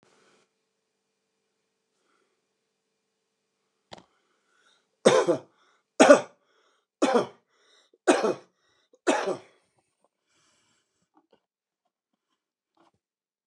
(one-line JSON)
{"cough_length": "13.5 s", "cough_amplitude": 29128, "cough_signal_mean_std_ratio": 0.21, "survey_phase": "beta (2021-08-13 to 2022-03-07)", "age": "65+", "gender": "Male", "wearing_mask": "No", "symptom_cough_any": true, "symptom_runny_or_blocked_nose": true, "symptom_change_to_sense_of_smell_or_taste": true, "symptom_loss_of_taste": true, "symptom_onset": "2 days", "smoker_status": "Never smoked", "respiratory_condition_asthma": false, "respiratory_condition_other": false, "recruitment_source": "Test and Trace", "submission_delay": "2 days", "covid_test_result": "Positive", "covid_test_method": "RT-qPCR", "covid_ct_value": 18.4, "covid_ct_gene": "S gene", "covid_ct_mean": 18.6, "covid_viral_load": "780000 copies/ml", "covid_viral_load_category": "Low viral load (10K-1M copies/ml)"}